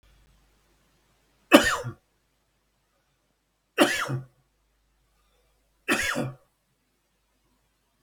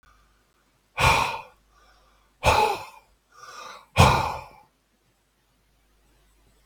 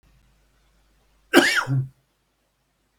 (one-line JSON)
{"three_cough_length": "8.0 s", "three_cough_amplitude": 32768, "three_cough_signal_mean_std_ratio": 0.24, "exhalation_length": "6.7 s", "exhalation_amplitude": 29842, "exhalation_signal_mean_std_ratio": 0.33, "cough_length": "3.0 s", "cough_amplitude": 32768, "cough_signal_mean_std_ratio": 0.3, "survey_phase": "beta (2021-08-13 to 2022-03-07)", "age": "65+", "gender": "Male", "wearing_mask": "No", "symptom_none": true, "smoker_status": "Never smoked", "respiratory_condition_asthma": false, "respiratory_condition_other": false, "recruitment_source": "REACT", "submission_delay": "3 days", "covid_test_result": "Negative", "covid_test_method": "RT-qPCR", "influenza_a_test_result": "Negative", "influenza_b_test_result": "Negative"}